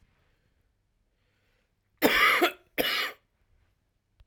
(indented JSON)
{
  "cough_length": "4.3 s",
  "cough_amplitude": 14531,
  "cough_signal_mean_std_ratio": 0.34,
  "survey_phase": "alpha (2021-03-01 to 2021-08-12)",
  "age": "18-44",
  "gender": "Male",
  "wearing_mask": "No",
  "symptom_none": true,
  "smoker_status": "Never smoked",
  "respiratory_condition_asthma": false,
  "respiratory_condition_other": false,
  "recruitment_source": "REACT",
  "submission_delay": "6 days",
  "covid_test_result": "Negative",
  "covid_test_method": "RT-qPCR"
}